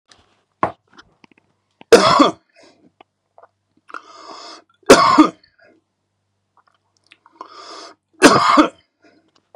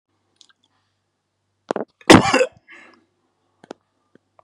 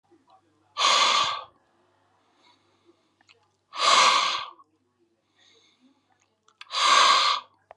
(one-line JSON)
{"three_cough_length": "9.6 s", "three_cough_amplitude": 32768, "three_cough_signal_mean_std_ratio": 0.29, "cough_length": "4.4 s", "cough_amplitude": 32768, "cough_signal_mean_std_ratio": 0.2, "exhalation_length": "7.8 s", "exhalation_amplitude": 17787, "exhalation_signal_mean_std_ratio": 0.41, "survey_phase": "beta (2021-08-13 to 2022-03-07)", "age": "18-44", "gender": "Male", "wearing_mask": "No", "symptom_none": true, "smoker_status": "Current smoker (e-cigarettes or vapes only)", "respiratory_condition_asthma": false, "respiratory_condition_other": false, "recruitment_source": "REACT", "submission_delay": "1 day", "covid_test_result": "Negative", "covid_test_method": "RT-qPCR"}